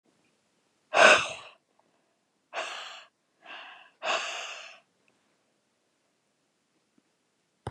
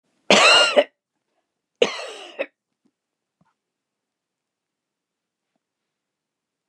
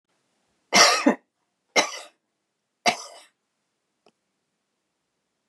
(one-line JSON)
{"exhalation_length": "7.7 s", "exhalation_amplitude": 20623, "exhalation_signal_mean_std_ratio": 0.24, "cough_length": "6.7 s", "cough_amplitude": 32401, "cough_signal_mean_std_ratio": 0.24, "three_cough_length": "5.5 s", "three_cough_amplitude": 24967, "three_cough_signal_mean_std_ratio": 0.25, "survey_phase": "beta (2021-08-13 to 2022-03-07)", "age": "65+", "gender": "Female", "wearing_mask": "No", "symptom_none": true, "smoker_status": "Never smoked", "respiratory_condition_asthma": false, "respiratory_condition_other": false, "recruitment_source": "REACT", "submission_delay": "4 days", "covid_test_result": "Negative", "covid_test_method": "RT-qPCR", "influenza_a_test_result": "Negative", "influenza_b_test_result": "Negative"}